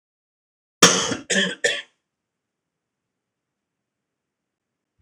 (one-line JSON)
{"three_cough_length": "5.0 s", "three_cough_amplitude": 26028, "three_cough_signal_mean_std_ratio": 0.25, "survey_phase": "alpha (2021-03-01 to 2021-08-12)", "age": "45-64", "gender": "Male", "wearing_mask": "No", "symptom_none": true, "smoker_status": "Never smoked", "respiratory_condition_asthma": false, "respiratory_condition_other": false, "recruitment_source": "REACT", "submission_delay": "2 days", "covid_test_result": "Negative", "covid_test_method": "RT-qPCR"}